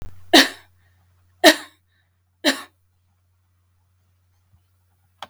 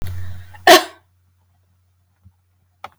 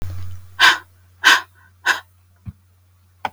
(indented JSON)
{
  "three_cough_length": "5.3 s",
  "three_cough_amplitude": 32766,
  "three_cough_signal_mean_std_ratio": 0.21,
  "cough_length": "3.0 s",
  "cough_amplitude": 32768,
  "cough_signal_mean_std_ratio": 0.27,
  "exhalation_length": "3.3 s",
  "exhalation_amplitude": 32768,
  "exhalation_signal_mean_std_ratio": 0.36,
  "survey_phase": "beta (2021-08-13 to 2022-03-07)",
  "age": "45-64",
  "gender": "Female",
  "wearing_mask": "No",
  "symptom_none": true,
  "smoker_status": "Never smoked",
  "respiratory_condition_asthma": false,
  "respiratory_condition_other": false,
  "recruitment_source": "REACT",
  "submission_delay": "4 days",
  "covid_test_result": "Negative",
  "covid_test_method": "RT-qPCR"
}